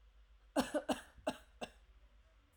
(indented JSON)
{
  "cough_length": "2.6 s",
  "cough_amplitude": 3121,
  "cough_signal_mean_std_ratio": 0.36,
  "survey_phase": "alpha (2021-03-01 to 2021-08-12)",
  "age": "45-64",
  "gender": "Female",
  "wearing_mask": "No",
  "symptom_none": true,
  "smoker_status": "Never smoked",
  "respiratory_condition_asthma": false,
  "respiratory_condition_other": false,
  "recruitment_source": "REACT",
  "submission_delay": "2 days",
  "covid_test_result": "Negative",
  "covid_test_method": "RT-qPCR"
}